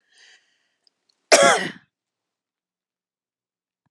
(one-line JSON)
{"cough_length": "3.9 s", "cough_amplitude": 32684, "cough_signal_mean_std_ratio": 0.22, "survey_phase": "alpha (2021-03-01 to 2021-08-12)", "age": "65+", "gender": "Female", "wearing_mask": "No", "symptom_none": true, "smoker_status": "Never smoked", "respiratory_condition_asthma": false, "respiratory_condition_other": false, "recruitment_source": "REACT", "submission_delay": "5 days", "covid_test_result": "Negative", "covid_test_method": "RT-qPCR"}